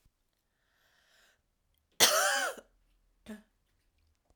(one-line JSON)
{"cough_length": "4.4 s", "cough_amplitude": 16525, "cough_signal_mean_std_ratio": 0.28, "survey_phase": "alpha (2021-03-01 to 2021-08-12)", "age": "45-64", "gender": "Female", "wearing_mask": "No", "symptom_cough_any": true, "symptom_fatigue": true, "symptom_headache": true, "smoker_status": "Never smoked", "respiratory_condition_asthma": false, "respiratory_condition_other": false, "recruitment_source": "Test and Trace", "submission_delay": "1 day", "covid_test_result": "Positive", "covid_test_method": "RT-qPCR", "covid_ct_value": 24.5, "covid_ct_gene": "ORF1ab gene"}